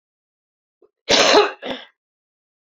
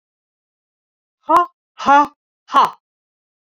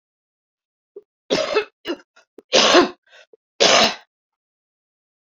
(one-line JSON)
{"cough_length": "2.7 s", "cough_amplitude": 30673, "cough_signal_mean_std_ratio": 0.33, "exhalation_length": "3.5 s", "exhalation_amplitude": 28675, "exhalation_signal_mean_std_ratio": 0.32, "three_cough_length": "5.2 s", "three_cough_amplitude": 32768, "three_cough_signal_mean_std_ratio": 0.35, "survey_phase": "beta (2021-08-13 to 2022-03-07)", "age": "45-64", "gender": "Female", "wearing_mask": "No", "symptom_cough_any": true, "symptom_runny_or_blocked_nose": true, "symptom_onset": "6 days", "smoker_status": "Never smoked", "respiratory_condition_asthma": true, "respiratory_condition_other": false, "recruitment_source": "Test and Trace", "submission_delay": "1 day", "covid_test_result": "Positive", "covid_test_method": "RT-qPCR", "covid_ct_value": 17.1, "covid_ct_gene": "ORF1ab gene", "covid_ct_mean": 17.5, "covid_viral_load": "1800000 copies/ml", "covid_viral_load_category": "High viral load (>1M copies/ml)"}